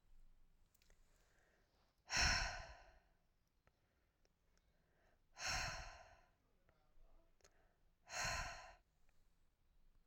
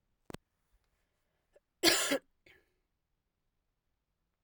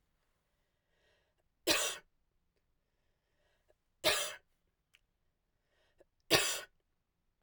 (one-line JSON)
{"exhalation_length": "10.1 s", "exhalation_amplitude": 1698, "exhalation_signal_mean_std_ratio": 0.34, "cough_length": "4.4 s", "cough_amplitude": 9075, "cough_signal_mean_std_ratio": 0.22, "three_cough_length": "7.4 s", "three_cough_amplitude": 7588, "three_cough_signal_mean_std_ratio": 0.25, "survey_phase": "beta (2021-08-13 to 2022-03-07)", "age": "45-64", "gender": "Female", "wearing_mask": "No", "symptom_cough_any": true, "symptom_runny_or_blocked_nose": true, "symptom_sore_throat": true, "symptom_other": true, "symptom_onset": "5 days", "smoker_status": "Never smoked", "respiratory_condition_asthma": false, "respiratory_condition_other": false, "recruitment_source": "Test and Trace", "submission_delay": "1 day", "covid_test_result": "Positive", "covid_test_method": "ePCR"}